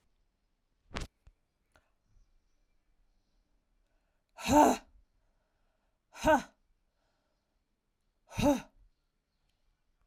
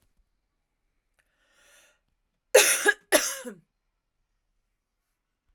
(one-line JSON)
{"exhalation_length": "10.1 s", "exhalation_amplitude": 9436, "exhalation_signal_mean_std_ratio": 0.22, "cough_length": "5.5 s", "cough_amplitude": 25642, "cough_signal_mean_std_ratio": 0.23, "survey_phase": "alpha (2021-03-01 to 2021-08-12)", "age": "18-44", "gender": "Female", "wearing_mask": "No", "symptom_none": true, "symptom_onset": "8 days", "smoker_status": "Never smoked", "respiratory_condition_asthma": false, "respiratory_condition_other": false, "recruitment_source": "REACT", "submission_delay": "2 days", "covid_test_result": "Negative", "covid_test_method": "RT-qPCR"}